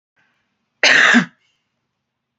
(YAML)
cough_length: 2.4 s
cough_amplitude: 32768
cough_signal_mean_std_ratio: 0.34
survey_phase: alpha (2021-03-01 to 2021-08-12)
age: 45-64
gender: Female
wearing_mask: 'No'
symptom_change_to_sense_of_smell_or_taste: true
symptom_onset: 8 days
smoker_status: Ex-smoker
respiratory_condition_asthma: false
respiratory_condition_other: false
recruitment_source: REACT
submission_delay: 1 day
covid_test_result: Negative
covid_test_method: RT-qPCR